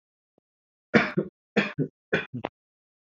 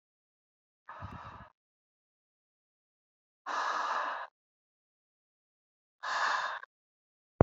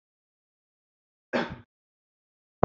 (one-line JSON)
{"three_cough_length": "3.1 s", "three_cough_amplitude": 20420, "three_cough_signal_mean_std_ratio": 0.32, "exhalation_length": "7.4 s", "exhalation_amplitude": 22705, "exhalation_signal_mean_std_ratio": 0.31, "cough_length": "2.6 s", "cough_amplitude": 25012, "cough_signal_mean_std_ratio": 0.17, "survey_phase": "beta (2021-08-13 to 2022-03-07)", "age": "18-44", "gender": "Male", "wearing_mask": "No", "symptom_none": true, "smoker_status": "Never smoked", "respiratory_condition_asthma": false, "respiratory_condition_other": false, "recruitment_source": "REACT", "submission_delay": "4 days", "covid_test_result": "Negative", "covid_test_method": "RT-qPCR", "influenza_a_test_result": "Negative", "influenza_b_test_result": "Negative"}